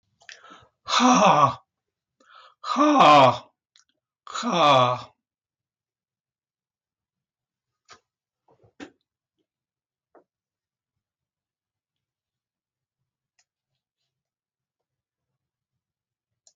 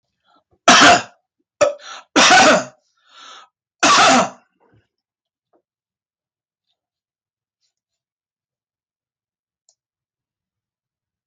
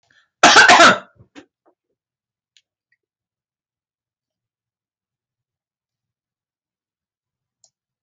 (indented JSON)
{
  "exhalation_length": "16.6 s",
  "exhalation_amplitude": 20396,
  "exhalation_signal_mean_std_ratio": 0.27,
  "three_cough_length": "11.3 s",
  "three_cough_amplitude": 32768,
  "three_cough_signal_mean_std_ratio": 0.31,
  "cough_length": "8.0 s",
  "cough_amplitude": 32768,
  "cough_signal_mean_std_ratio": 0.22,
  "survey_phase": "beta (2021-08-13 to 2022-03-07)",
  "age": "65+",
  "gender": "Male",
  "wearing_mask": "No",
  "symptom_fever_high_temperature": true,
  "smoker_status": "Never smoked",
  "respiratory_condition_asthma": false,
  "respiratory_condition_other": false,
  "recruitment_source": "Test and Trace",
  "submission_delay": "5 days",
  "covid_test_result": "Negative",
  "covid_test_method": "LFT"
}